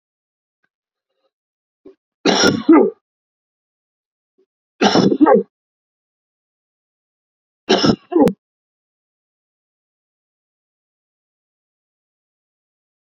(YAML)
three_cough_length: 13.1 s
three_cough_amplitude: 32767
three_cough_signal_mean_std_ratio: 0.27
survey_phase: beta (2021-08-13 to 2022-03-07)
age: 18-44
gender: Male
wearing_mask: 'No'
symptom_none: true
smoker_status: Ex-smoker
respiratory_condition_asthma: false
respiratory_condition_other: false
recruitment_source: REACT
submission_delay: 2 days
covid_test_result: Negative
covid_test_method: RT-qPCR